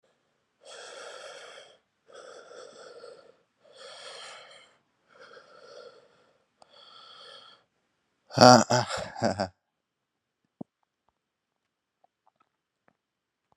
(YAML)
exhalation_length: 13.6 s
exhalation_amplitude: 32767
exhalation_signal_mean_std_ratio: 0.18
survey_phase: alpha (2021-03-01 to 2021-08-12)
age: 18-44
gender: Male
wearing_mask: 'No'
symptom_cough_any: true
symptom_shortness_of_breath: true
symptom_fatigue: true
symptom_headache: true
symptom_change_to_sense_of_smell_or_taste: true
symptom_loss_of_taste: true
symptom_onset: 3 days
smoker_status: Never smoked
respiratory_condition_asthma: false
respiratory_condition_other: false
recruitment_source: Test and Trace
submission_delay: 2 days
covid_test_result: Positive
covid_test_method: RT-qPCR
covid_ct_value: 15.1
covid_ct_gene: ORF1ab gene
covid_ct_mean: 15.4
covid_viral_load: 8600000 copies/ml
covid_viral_load_category: High viral load (>1M copies/ml)